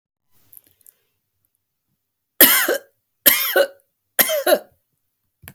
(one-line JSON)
{"three_cough_length": "5.5 s", "three_cough_amplitude": 32768, "three_cough_signal_mean_std_ratio": 0.32, "survey_phase": "beta (2021-08-13 to 2022-03-07)", "age": "65+", "gender": "Female", "wearing_mask": "No", "symptom_none": true, "smoker_status": "Never smoked", "respiratory_condition_asthma": false, "respiratory_condition_other": false, "recruitment_source": "REACT", "submission_delay": "1 day", "covid_test_result": "Negative", "covid_test_method": "RT-qPCR", "influenza_a_test_result": "Unknown/Void", "influenza_b_test_result": "Unknown/Void"}